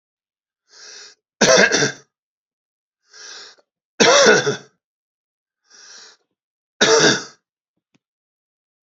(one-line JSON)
{"three_cough_length": "8.9 s", "three_cough_amplitude": 32596, "three_cough_signal_mean_std_ratio": 0.33, "survey_phase": "beta (2021-08-13 to 2022-03-07)", "age": "65+", "gender": "Male", "wearing_mask": "No", "symptom_none": true, "smoker_status": "Never smoked", "respiratory_condition_asthma": false, "respiratory_condition_other": false, "recruitment_source": "REACT", "submission_delay": "2 days", "covid_test_result": "Negative", "covid_test_method": "RT-qPCR"}